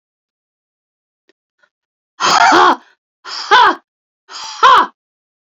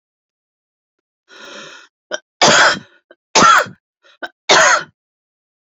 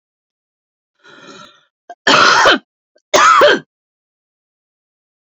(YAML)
exhalation_length: 5.5 s
exhalation_amplitude: 29641
exhalation_signal_mean_std_ratio: 0.39
three_cough_length: 5.7 s
three_cough_amplitude: 31131
three_cough_signal_mean_std_ratio: 0.36
cough_length: 5.2 s
cough_amplitude: 31207
cough_signal_mean_std_ratio: 0.38
survey_phase: beta (2021-08-13 to 2022-03-07)
age: 45-64
gender: Female
wearing_mask: 'No'
symptom_cough_any: true
symptom_sore_throat: true
symptom_headache: true
symptom_onset: 12 days
smoker_status: Never smoked
respiratory_condition_asthma: false
respiratory_condition_other: false
recruitment_source: REACT
submission_delay: 2 days
covid_test_result: Negative
covid_test_method: RT-qPCR